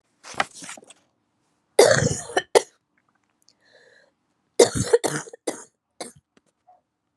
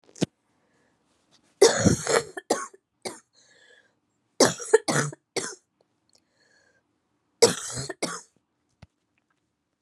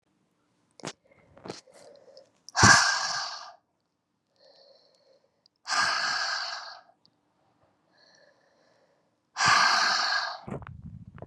{"cough_length": "7.2 s", "cough_amplitude": 31880, "cough_signal_mean_std_ratio": 0.27, "three_cough_length": "9.8 s", "three_cough_amplitude": 26386, "three_cough_signal_mean_std_ratio": 0.28, "exhalation_length": "11.3 s", "exhalation_amplitude": 21324, "exhalation_signal_mean_std_ratio": 0.37, "survey_phase": "beta (2021-08-13 to 2022-03-07)", "age": "18-44", "gender": "Female", "wearing_mask": "No", "symptom_cough_any": true, "symptom_new_continuous_cough": true, "symptom_runny_or_blocked_nose": true, "symptom_sore_throat": true, "symptom_change_to_sense_of_smell_or_taste": true, "symptom_onset": "6 days", "smoker_status": "Ex-smoker", "respiratory_condition_asthma": false, "respiratory_condition_other": false, "recruitment_source": "Test and Trace", "submission_delay": "2 days", "covid_test_result": "Positive", "covid_test_method": "RT-qPCR"}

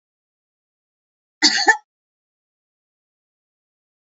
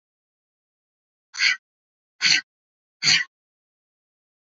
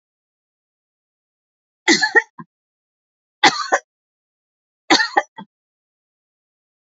{"cough_length": "4.2 s", "cough_amplitude": 32447, "cough_signal_mean_std_ratio": 0.19, "exhalation_length": "4.5 s", "exhalation_amplitude": 21329, "exhalation_signal_mean_std_ratio": 0.27, "three_cough_length": "7.0 s", "three_cough_amplitude": 29478, "three_cough_signal_mean_std_ratio": 0.24, "survey_phase": "beta (2021-08-13 to 2022-03-07)", "age": "45-64", "gender": "Female", "wearing_mask": "No", "symptom_none": true, "smoker_status": "Never smoked", "respiratory_condition_asthma": false, "respiratory_condition_other": false, "recruitment_source": "REACT", "submission_delay": "2 days", "covid_test_result": "Negative", "covid_test_method": "RT-qPCR"}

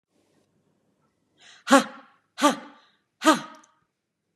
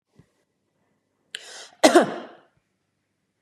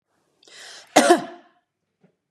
{"exhalation_length": "4.4 s", "exhalation_amplitude": 31030, "exhalation_signal_mean_std_ratio": 0.23, "three_cough_length": "3.4 s", "three_cough_amplitude": 32092, "three_cough_signal_mean_std_ratio": 0.22, "cough_length": "2.3 s", "cough_amplitude": 30963, "cough_signal_mean_std_ratio": 0.27, "survey_phase": "beta (2021-08-13 to 2022-03-07)", "age": "45-64", "gender": "Female", "wearing_mask": "No", "symptom_none": true, "smoker_status": "Ex-smoker", "respiratory_condition_asthma": false, "respiratory_condition_other": false, "recruitment_source": "REACT", "submission_delay": "4 days", "covid_test_result": "Negative", "covid_test_method": "RT-qPCR", "influenza_a_test_result": "Negative", "influenza_b_test_result": "Negative"}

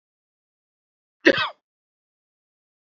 {"cough_length": "2.9 s", "cough_amplitude": 26609, "cough_signal_mean_std_ratio": 0.18, "survey_phase": "beta (2021-08-13 to 2022-03-07)", "age": "65+", "gender": "Male", "wearing_mask": "No", "symptom_none": true, "smoker_status": "Never smoked", "respiratory_condition_asthma": false, "respiratory_condition_other": false, "recruitment_source": "REACT", "submission_delay": "1 day", "covid_test_result": "Negative", "covid_test_method": "RT-qPCR", "influenza_a_test_result": "Negative", "influenza_b_test_result": "Negative"}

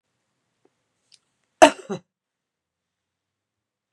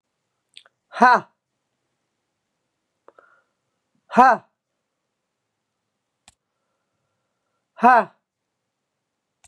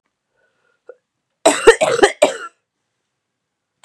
{"cough_length": "3.9 s", "cough_amplitude": 32768, "cough_signal_mean_std_ratio": 0.12, "exhalation_length": "9.5 s", "exhalation_amplitude": 32762, "exhalation_signal_mean_std_ratio": 0.19, "three_cough_length": "3.8 s", "three_cough_amplitude": 32768, "three_cough_signal_mean_std_ratio": 0.29, "survey_phase": "beta (2021-08-13 to 2022-03-07)", "age": "45-64", "gender": "Female", "wearing_mask": "No", "symptom_cough_any": true, "symptom_other": true, "symptom_onset": "10 days", "smoker_status": "Ex-smoker", "respiratory_condition_asthma": false, "respiratory_condition_other": false, "recruitment_source": "Test and Trace", "submission_delay": "1 day", "covid_test_result": "Positive", "covid_test_method": "RT-qPCR", "covid_ct_value": 23.6, "covid_ct_gene": "ORF1ab gene"}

